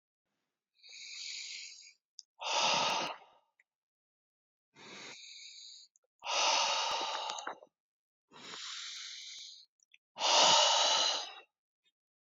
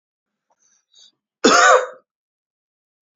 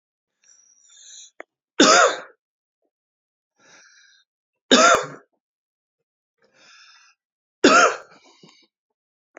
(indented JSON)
{
  "exhalation_length": "12.2 s",
  "exhalation_amplitude": 7119,
  "exhalation_signal_mean_std_ratio": 0.45,
  "cough_length": "3.2 s",
  "cough_amplitude": 29268,
  "cough_signal_mean_std_ratio": 0.29,
  "three_cough_length": "9.4 s",
  "three_cough_amplitude": 29398,
  "three_cough_signal_mean_std_ratio": 0.27,
  "survey_phase": "alpha (2021-03-01 to 2021-08-12)",
  "age": "45-64",
  "gender": "Male",
  "wearing_mask": "No",
  "symptom_change_to_sense_of_smell_or_taste": true,
  "smoker_status": "Never smoked",
  "respiratory_condition_asthma": false,
  "respiratory_condition_other": false,
  "recruitment_source": "Test and Trace",
  "submission_delay": "2 days",
  "covid_test_result": "Positive",
  "covid_test_method": "RT-qPCR",
  "covid_ct_value": 15.5,
  "covid_ct_gene": "N gene",
  "covid_ct_mean": 16.5,
  "covid_viral_load": "4000000 copies/ml",
  "covid_viral_load_category": "High viral load (>1M copies/ml)"
}